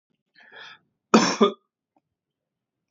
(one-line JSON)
{"cough_length": "2.9 s", "cough_amplitude": 25473, "cough_signal_mean_std_ratio": 0.26, "survey_phase": "beta (2021-08-13 to 2022-03-07)", "age": "18-44", "gender": "Male", "wearing_mask": "No", "symptom_none": true, "symptom_onset": "6 days", "smoker_status": "Never smoked", "respiratory_condition_asthma": false, "respiratory_condition_other": false, "recruitment_source": "REACT", "submission_delay": "3 days", "covid_test_result": "Negative", "covid_test_method": "RT-qPCR", "influenza_a_test_result": "Positive", "influenza_a_ct_value": 33.6, "influenza_b_test_result": "Negative"}